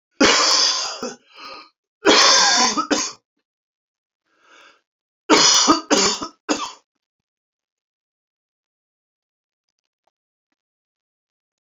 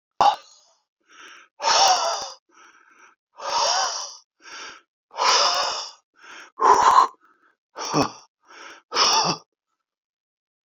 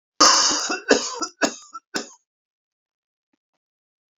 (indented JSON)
{
  "three_cough_length": "11.6 s",
  "three_cough_amplitude": 29664,
  "three_cough_signal_mean_std_ratio": 0.39,
  "exhalation_length": "10.8 s",
  "exhalation_amplitude": 27197,
  "exhalation_signal_mean_std_ratio": 0.44,
  "cough_length": "4.2 s",
  "cough_amplitude": 30178,
  "cough_signal_mean_std_ratio": 0.36,
  "survey_phase": "beta (2021-08-13 to 2022-03-07)",
  "age": "45-64",
  "gender": "Male",
  "wearing_mask": "No",
  "symptom_none": true,
  "smoker_status": "Ex-smoker",
  "respiratory_condition_asthma": false,
  "respiratory_condition_other": false,
  "recruitment_source": "REACT",
  "submission_delay": "2 days",
  "covid_test_result": "Negative",
  "covid_test_method": "RT-qPCR"
}